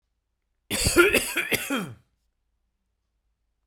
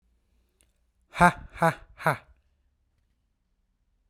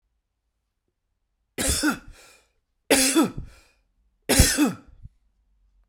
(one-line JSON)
{"cough_length": "3.7 s", "cough_amplitude": 19031, "cough_signal_mean_std_ratio": 0.38, "exhalation_length": "4.1 s", "exhalation_amplitude": 22529, "exhalation_signal_mean_std_ratio": 0.22, "three_cough_length": "5.9 s", "three_cough_amplitude": 27700, "three_cough_signal_mean_std_ratio": 0.37, "survey_phase": "beta (2021-08-13 to 2022-03-07)", "age": "18-44", "gender": "Male", "wearing_mask": "No", "symptom_none": true, "smoker_status": "Ex-smoker", "respiratory_condition_asthma": false, "respiratory_condition_other": false, "recruitment_source": "REACT", "submission_delay": "1 day", "covid_test_result": "Negative", "covid_test_method": "RT-qPCR"}